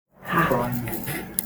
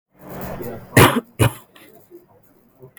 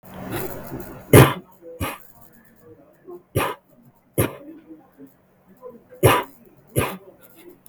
{"exhalation_length": "1.5 s", "exhalation_amplitude": 32768, "exhalation_signal_mean_std_ratio": 0.76, "cough_length": "3.0 s", "cough_amplitude": 32768, "cough_signal_mean_std_ratio": 0.32, "three_cough_length": "7.7 s", "three_cough_amplitude": 32768, "three_cough_signal_mean_std_ratio": 0.3, "survey_phase": "beta (2021-08-13 to 2022-03-07)", "age": "18-44", "gender": "Female", "wearing_mask": "No", "symptom_cough_any": true, "smoker_status": "Never smoked", "respiratory_condition_asthma": false, "respiratory_condition_other": false, "recruitment_source": "REACT", "submission_delay": "1 day", "covid_test_result": "Negative", "covid_test_method": "RT-qPCR", "influenza_a_test_result": "Unknown/Void", "influenza_b_test_result": "Unknown/Void"}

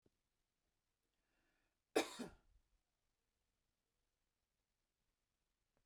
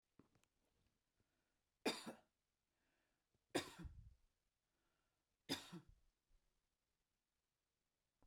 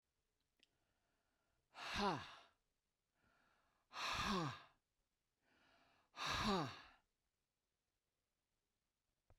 {"cough_length": "5.9 s", "cough_amplitude": 2386, "cough_signal_mean_std_ratio": 0.14, "three_cough_length": "8.3 s", "three_cough_amplitude": 1224, "three_cough_signal_mean_std_ratio": 0.22, "exhalation_length": "9.4 s", "exhalation_amplitude": 1300, "exhalation_signal_mean_std_ratio": 0.34, "survey_phase": "beta (2021-08-13 to 2022-03-07)", "age": "65+", "gender": "Female", "wearing_mask": "No", "symptom_none": true, "smoker_status": "Ex-smoker", "respiratory_condition_asthma": false, "respiratory_condition_other": false, "recruitment_source": "REACT", "submission_delay": "1 day", "covid_test_result": "Negative", "covid_test_method": "RT-qPCR"}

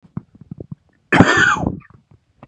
{"cough_length": "2.5 s", "cough_amplitude": 32768, "cough_signal_mean_std_ratio": 0.4, "survey_phase": "beta (2021-08-13 to 2022-03-07)", "age": "18-44", "gender": "Male", "wearing_mask": "No", "symptom_cough_any": true, "symptom_runny_or_blocked_nose": true, "symptom_sore_throat": true, "symptom_onset": "4 days", "smoker_status": "Never smoked", "respiratory_condition_asthma": false, "respiratory_condition_other": false, "recruitment_source": "Test and Trace", "submission_delay": "2 days", "covid_test_result": "Positive", "covid_test_method": "RT-qPCR", "covid_ct_value": 18.3, "covid_ct_gene": "ORF1ab gene", "covid_ct_mean": 18.8, "covid_viral_load": "710000 copies/ml", "covid_viral_load_category": "Low viral load (10K-1M copies/ml)"}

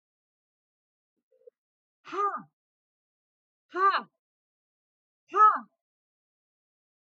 {"exhalation_length": "7.1 s", "exhalation_amplitude": 9857, "exhalation_signal_mean_std_ratio": 0.24, "survey_phase": "alpha (2021-03-01 to 2021-08-12)", "age": "45-64", "gender": "Female", "wearing_mask": "No", "symptom_none": true, "smoker_status": "Ex-smoker", "respiratory_condition_asthma": false, "respiratory_condition_other": false, "recruitment_source": "REACT", "submission_delay": "2 days", "covid_test_result": "Negative", "covid_test_method": "RT-qPCR"}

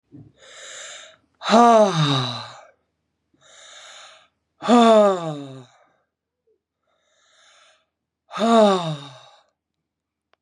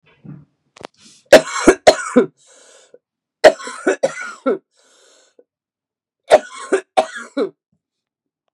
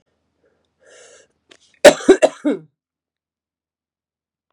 {"exhalation_length": "10.4 s", "exhalation_amplitude": 25291, "exhalation_signal_mean_std_ratio": 0.37, "three_cough_length": "8.5 s", "three_cough_amplitude": 32768, "three_cough_signal_mean_std_ratio": 0.28, "cough_length": "4.5 s", "cough_amplitude": 32768, "cough_signal_mean_std_ratio": 0.2, "survey_phase": "beta (2021-08-13 to 2022-03-07)", "age": "18-44", "gender": "Female", "wearing_mask": "No", "symptom_cough_any": true, "symptom_runny_or_blocked_nose": true, "symptom_shortness_of_breath": true, "symptom_sore_throat": true, "symptom_diarrhoea": true, "symptom_fatigue": true, "symptom_headache": true, "smoker_status": "Never smoked", "respiratory_condition_asthma": false, "respiratory_condition_other": false, "recruitment_source": "Test and Trace", "submission_delay": "2 days", "covid_test_result": "Positive", "covid_test_method": "LFT"}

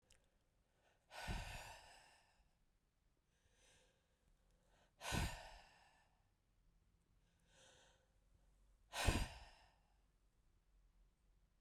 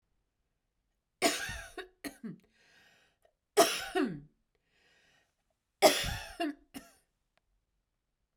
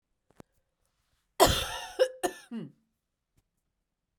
{"exhalation_length": "11.6 s", "exhalation_amplitude": 2622, "exhalation_signal_mean_std_ratio": 0.29, "three_cough_length": "8.4 s", "three_cough_amplitude": 12838, "three_cough_signal_mean_std_ratio": 0.29, "cough_length": "4.2 s", "cough_amplitude": 19631, "cough_signal_mean_std_ratio": 0.27, "survey_phase": "beta (2021-08-13 to 2022-03-07)", "age": "45-64", "gender": "Female", "wearing_mask": "No", "symptom_runny_or_blocked_nose": true, "symptom_onset": "9 days", "smoker_status": "Ex-smoker", "respiratory_condition_asthma": false, "respiratory_condition_other": false, "recruitment_source": "REACT", "submission_delay": "0 days", "covid_test_result": "Negative", "covid_test_method": "RT-qPCR"}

